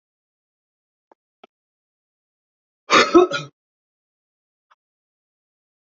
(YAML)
cough_length: 5.9 s
cough_amplitude: 31440
cough_signal_mean_std_ratio: 0.19
survey_phase: beta (2021-08-13 to 2022-03-07)
age: 65+
gender: Male
wearing_mask: 'No'
symptom_cough_any: true
symptom_headache: true
symptom_loss_of_taste: true
symptom_onset: 6 days
smoker_status: Ex-smoker
respiratory_condition_asthma: true
respiratory_condition_other: false
recruitment_source: Test and Trace
submission_delay: 2 days
covid_test_result: Positive
covid_test_method: ePCR